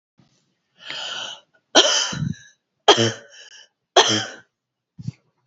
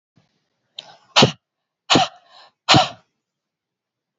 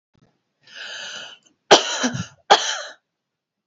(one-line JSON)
{"three_cough_length": "5.5 s", "three_cough_amplitude": 32768, "three_cough_signal_mean_std_ratio": 0.35, "exhalation_length": "4.2 s", "exhalation_amplitude": 32767, "exhalation_signal_mean_std_ratio": 0.27, "cough_length": "3.7 s", "cough_amplitude": 32768, "cough_signal_mean_std_ratio": 0.31, "survey_phase": "beta (2021-08-13 to 2022-03-07)", "age": "18-44", "gender": "Female", "wearing_mask": "No", "symptom_none": true, "smoker_status": "Never smoked", "respiratory_condition_asthma": false, "respiratory_condition_other": false, "recruitment_source": "REACT", "submission_delay": "2 days", "covid_test_result": "Negative", "covid_test_method": "RT-qPCR", "influenza_a_test_result": "Negative", "influenza_b_test_result": "Negative"}